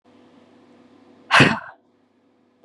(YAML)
exhalation_length: 2.6 s
exhalation_amplitude: 30629
exhalation_signal_mean_std_ratio: 0.26
survey_phase: beta (2021-08-13 to 2022-03-07)
age: 45-64
gender: Female
wearing_mask: 'No'
symptom_cough_any: true
symptom_onset: 4 days
smoker_status: Current smoker (e-cigarettes or vapes only)
respiratory_condition_asthma: false
respiratory_condition_other: false
recruitment_source: Test and Trace
submission_delay: 2 days
covid_test_result: Positive
covid_test_method: RT-qPCR